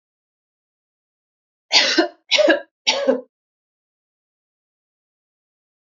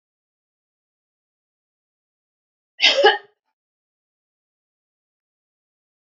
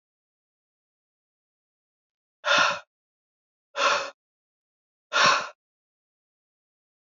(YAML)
three_cough_length: 5.8 s
three_cough_amplitude: 29276
three_cough_signal_mean_std_ratio: 0.31
cough_length: 6.1 s
cough_amplitude: 26958
cough_signal_mean_std_ratio: 0.18
exhalation_length: 7.1 s
exhalation_amplitude: 15895
exhalation_signal_mean_std_ratio: 0.28
survey_phase: beta (2021-08-13 to 2022-03-07)
age: 18-44
gender: Female
wearing_mask: 'No'
symptom_none: true
smoker_status: Never smoked
respiratory_condition_asthma: false
respiratory_condition_other: false
recruitment_source: Test and Trace
submission_delay: 0 days
covid_test_result: Negative
covid_test_method: LFT